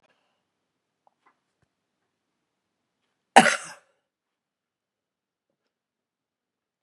{"cough_length": "6.8 s", "cough_amplitude": 32767, "cough_signal_mean_std_ratio": 0.11, "survey_phase": "beta (2021-08-13 to 2022-03-07)", "age": "65+", "gender": "Female", "wearing_mask": "No", "symptom_runny_or_blocked_nose": true, "smoker_status": "Ex-smoker", "respiratory_condition_asthma": false, "respiratory_condition_other": false, "recruitment_source": "REACT", "submission_delay": "1 day", "covid_test_result": "Negative", "covid_test_method": "RT-qPCR", "influenza_a_test_result": "Negative", "influenza_b_test_result": "Negative"}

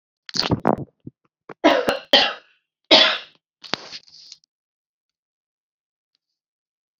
{"three_cough_length": "7.0 s", "three_cough_amplitude": 30347, "three_cough_signal_mean_std_ratio": 0.29, "survey_phase": "beta (2021-08-13 to 2022-03-07)", "age": "45-64", "gender": "Female", "wearing_mask": "No", "symptom_none": true, "smoker_status": "Ex-smoker", "respiratory_condition_asthma": true, "respiratory_condition_other": false, "recruitment_source": "Test and Trace", "submission_delay": "-2 days", "covid_test_result": "Negative", "covid_test_method": "RT-qPCR"}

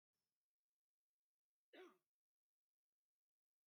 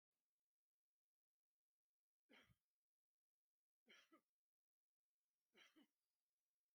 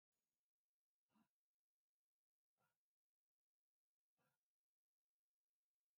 {"cough_length": "3.7 s", "cough_amplitude": 81, "cough_signal_mean_std_ratio": 0.19, "three_cough_length": "6.7 s", "three_cough_amplitude": 35, "three_cough_signal_mean_std_ratio": 0.27, "exhalation_length": "6.0 s", "exhalation_amplitude": 10, "exhalation_signal_mean_std_ratio": 0.21, "survey_phase": "beta (2021-08-13 to 2022-03-07)", "age": "45-64", "gender": "Male", "wearing_mask": "No", "symptom_none": true, "smoker_status": "Never smoked", "respiratory_condition_asthma": false, "respiratory_condition_other": false, "recruitment_source": "REACT", "submission_delay": "32 days", "covid_test_result": "Negative", "covid_test_method": "RT-qPCR", "influenza_a_test_result": "Negative", "influenza_b_test_result": "Negative"}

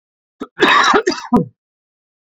{"cough_length": "2.2 s", "cough_amplitude": 28272, "cough_signal_mean_std_ratio": 0.47, "survey_phase": "beta (2021-08-13 to 2022-03-07)", "age": "45-64", "gender": "Male", "wearing_mask": "No", "symptom_none": true, "smoker_status": "Current smoker (11 or more cigarettes per day)", "respiratory_condition_asthma": false, "respiratory_condition_other": false, "recruitment_source": "REACT", "submission_delay": "1 day", "covid_test_result": "Negative", "covid_test_method": "RT-qPCR"}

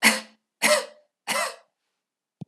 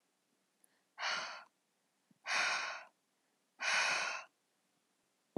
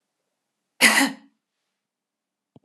{"three_cough_length": "2.5 s", "three_cough_amplitude": 23429, "three_cough_signal_mean_std_ratio": 0.37, "exhalation_length": "5.4 s", "exhalation_amplitude": 2560, "exhalation_signal_mean_std_ratio": 0.44, "cough_length": "2.6 s", "cough_amplitude": 27267, "cough_signal_mean_std_ratio": 0.26, "survey_phase": "beta (2021-08-13 to 2022-03-07)", "age": "18-44", "gender": "Female", "wearing_mask": "No", "symptom_none": true, "smoker_status": "Never smoked", "respiratory_condition_asthma": false, "respiratory_condition_other": false, "recruitment_source": "REACT", "submission_delay": "1 day", "covid_test_result": "Negative", "covid_test_method": "RT-qPCR", "influenza_a_test_result": "Unknown/Void", "influenza_b_test_result": "Unknown/Void"}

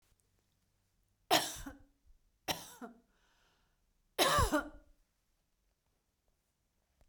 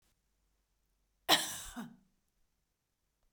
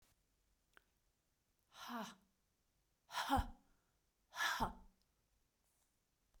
{"three_cough_length": "7.1 s", "three_cough_amplitude": 6408, "three_cough_signal_mean_std_ratio": 0.27, "cough_length": "3.3 s", "cough_amplitude": 8097, "cough_signal_mean_std_ratio": 0.22, "exhalation_length": "6.4 s", "exhalation_amplitude": 1687, "exhalation_signal_mean_std_ratio": 0.31, "survey_phase": "beta (2021-08-13 to 2022-03-07)", "age": "45-64", "gender": "Female", "wearing_mask": "No", "symptom_none": true, "smoker_status": "Never smoked", "respiratory_condition_asthma": false, "respiratory_condition_other": false, "recruitment_source": "REACT", "submission_delay": "1 day", "covid_test_result": "Negative", "covid_test_method": "RT-qPCR"}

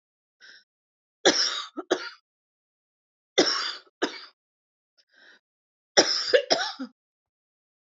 {"three_cough_length": "7.9 s", "three_cough_amplitude": 22479, "three_cough_signal_mean_std_ratio": 0.32, "survey_phase": "beta (2021-08-13 to 2022-03-07)", "age": "45-64", "gender": "Female", "wearing_mask": "No", "symptom_cough_any": true, "symptom_fatigue": true, "symptom_change_to_sense_of_smell_or_taste": true, "symptom_loss_of_taste": true, "symptom_onset": "8 days", "smoker_status": "Never smoked", "respiratory_condition_asthma": false, "respiratory_condition_other": false, "recruitment_source": "Test and Trace", "submission_delay": "2 days", "covid_test_result": "Positive", "covid_test_method": "RT-qPCR", "covid_ct_value": 15.0, "covid_ct_gene": "ORF1ab gene", "covid_ct_mean": 15.3, "covid_viral_load": "9900000 copies/ml", "covid_viral_load_category": "High viral load (>1M copies/ml)"}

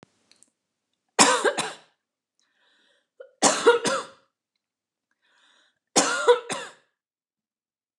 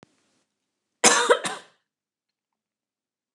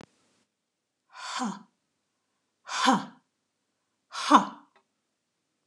{"three_cough_length": "8.0 s", "three_cough_amplitude": 28411, "three_cough_signal_mean_std_ratio": 0.31, "cough_length": "3.3 s", "cough_amplitude": 27595, "cough_signal_mean_std_ratio": 0.26, "exhalation_length": "5.7 s", "exhalation_amplitude": 23229, "exhalation_signal_mean_std_ratio": 0.26, "survey_phase": "alpha (2021-03-01 to 2021-08-12)", "age": "45-64", "gender": "Female", "wearing_mask": "No", "symptom_abdominal_pain": true, "symptom_diarrhoea": true, "symptom_onset": "13 days", "smoker_status": "Never smoked", "respiratory_condition_asthma": false, "respiratory_condition_other": false, "recruitment_source": "REACT", "submission_delay": "1 day", "covid_test_result": "Negative", "covid_test_method": "RT-qPCR"}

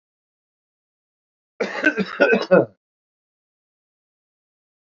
{"cough_length": "4.9 s", "cough_amplitude": 26078, "cough_signal_mean_std_ratio": 0.28, "survey_phase": "alpha (2021-03-01 to 2021-08-12)", "age": "45-64", "gender": "Male", "wearing_mask": "No", "symptom_cough_any": true, "symptom_onset": "5 days", "smoker_status": "Current smoker (1 to 10 cigarettes per day)", "respiratory_condition_asthma": true, "respiratory_condition_other": true, "recruitment_source": "Test and Trace", "submission_delay": "2 days", "covid_test_result": "Positive", "covid_test_method": "RT-qPCR"}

